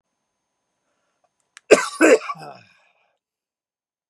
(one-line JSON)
{"cough_length": "4.1 s", "cough_amplitude": 32768, "cough_signal_mean_std_ratio": 0.23, "survey_phase": "beta (2021-08-13 to 2022-03-07)", "age": "45-64", "gender": "Male", "wearing_mask": "No", "symptom_shortness_of_breath": true, "symptom_fatigue": true, "symptom_onset": "4 days", "smoker_status": "Ex-smoker", "respiratory_condition_asthma": false, "respiratory_condition_other": false, "recruitment_source": "Test and Trace", "submission_delay": "2 days", "covid_test_result": "Positive", "covid_test_method": "RT-qPCR", "covid_ct_value": 39.5, "covid_ct_gene": "N gene"}